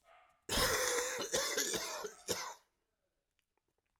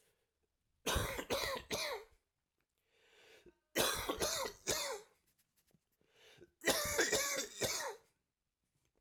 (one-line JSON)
{"cough_length": "4.0 s", "cough_amplitude": 3720, "cough_signal_mean_std_ratio": 0.57, "three_cough_length": "9.0 s", "three_cough_amplitude": 4023, "three_cough_signal_mean_std_ratio": 0.49, "survey_phase": "alpha (2021-03-01 to 2021-08-12)", "age": "45-64", "gender": "Male", "wearing_mask": "No", "symptom_cough_any": true, "symptom_shortness_of_breath": true, "symptom_abdominal_pain": true, "symptom_fatigue": true, "symptom_headache": true, "symptom_onset": "3 days", "smoker_status": "Never smoked", "respiratory_condition_asthma": false, "respiratory_condition_other": false, "recruitment_source": "Test and Trace", "submission_delay": "1 day", "covid_test_result": "Positive", "covid_test_method": "RT-qPCR", "covid_ct_value": 21.4, "covid_ct_gene": "ORF1ab gene"}